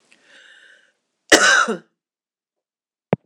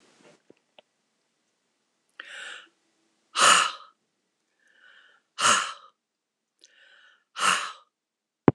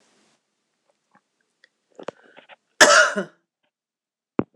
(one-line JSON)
{"cough_length": "3.3 s", "cough_amplitude": 26028, "cough_signal_mean_std_ratio": 0.29, "exhalation_length": "8.5 s", "exhalation_amplitude": 26027, "exhalation_signal_mean_std_ratio": 0.26, "three_cough_length": "4.6 s", "three_cough_amplitude": 26028, "three_cough_signal_mean_std_ratio": 0.23, "survey_phase": "beta (2021-08-13 to 2022-03-07)", "age": "65+", "gender": "Female", "wearing_mask": "No", "symptom_none": true, "symptom_onset": "8 days", "smoker_status": "Ex-smoker", "respiratory_condition_asthma": false, "respiratory_condition_other": false, "recruitment_source": "REACT", "submission_delay": "1 day", "covid_test_result": "Negative", "covid_test_method": "RT-qPCR", "influenza_a_test_result": "Negative", "influenza_b_test_result": "Negative"}